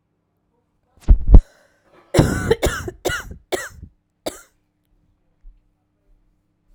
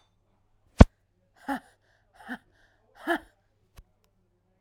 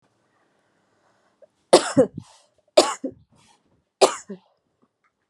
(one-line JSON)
{"cough_length": "6.7 s", "cough_amplitude": 32768, "cough_signal_mean_std_ratio": 0.26, "exhalation_length": "4.6 s", "exhalation_amplitude": 32768, "exhalation_signal_mean_std_ratio": 0.12, "three_cough_length": "5.3 s", "three_cough_amplitude": 32183, "three_cough_signal_mean_std_ratio": 0.23, "survey_phase": "alpha (2021-03-01 to 2021-08-12)", "age": "18-44", "gender": "Female", "wearing_mask": "No", "symptom_cough_any": true, "symptom_shortness_of_breath": true, "symptom_fatigue": true, "symptom_headache": true, "symptom_change_to_sense_of_smell_or_taste": true, "symptom_loss_of_taste": true, "symptom_onset": "4 days", "smoker_status": "Current smoker (e-cigarettes or vapes only)", "respiratory_condition_asthma": true, "respiratory_condition_other": false, "recruitment_source": "Test and Trace", "submission_delay": "2 days", "covid_test_result": "Positive", "covid_test_method": "RT-qPCR", "covid_ct_value": 15.7, "covid_ct_gene": "ORF1ab gene", "covid_ct_mean": 16.2, "covid_viral_load": "4900000 copies/ml", "covid_viral_load_category": "High viral load (>1M copies/ml)"}